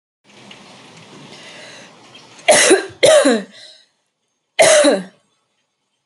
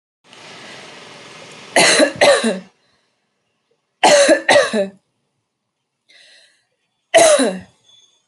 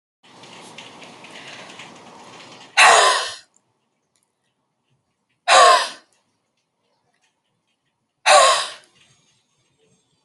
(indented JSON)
{
  "cough_length": "6.1 s",
  "cough_amplitude": 32077,
  "cough_signal_mean_std_ratio": 0.39,
  "three_cough_length": "8.3 s",
  "three_cough_amplitude": 32767,
  "three_cough_signal_mean_std_ratio": 0.41,
  "exhalation_length": "10.2 s",
  "exhalation_amplitude": 32077,
  "exhalation_signal_mean_std_ratio": 0.3,
  "survey_phase": "alpha (2021-03-01 to 2021-08-12)",
  "age": "45-64",
  "gender": "Female",
  "wearing_mask": "No",
  "symptom_none": true,
  "smoker_status": "Ex-smoker",
  "respiratory_condition_asthma": false,
  "respiratory_condition_other": false,
  "recruitment_source": "REACT",
  "submission_delay": "1 day",
  "covid_test_result": "Negative",
  "covid_test_method": "RT-qPCR"
}